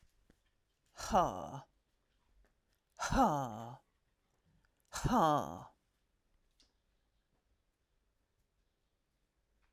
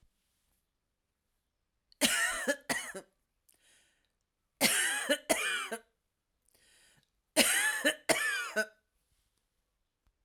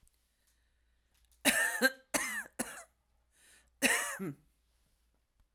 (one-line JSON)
{"exhalation_length": "9.7 s", "exhalation_amplitude": 4590, "exhalation_signal_mean_std_ratio": 0.3, "three_cough_length": "10.2 s", "three_cough_amplitude": 12203, "three_cough_signal_mean_std_ratio": 0.4, "cough_length": "5.5 s", "cough_amplitude": 10449, "cough_signal_mean_std_ratio": 0.36, "survey_phase": "alpha (2021-03-01 to 2021-08-12)", "age": "45-64", "gender": "Female", "wearing_mask": "No", "symptom_fatigue": true, "symptom_headache": true, "symptom_onset": "9 days", "smoker_status": "Ex-smoker", "respiratory_condition_asthma": false, "respiratory_condition_other": false, "recruitment_source": "REACT", "submission_delay": "1 day", "covid_test_result": "Negative", "covid_test_method": "RT-qPCR"}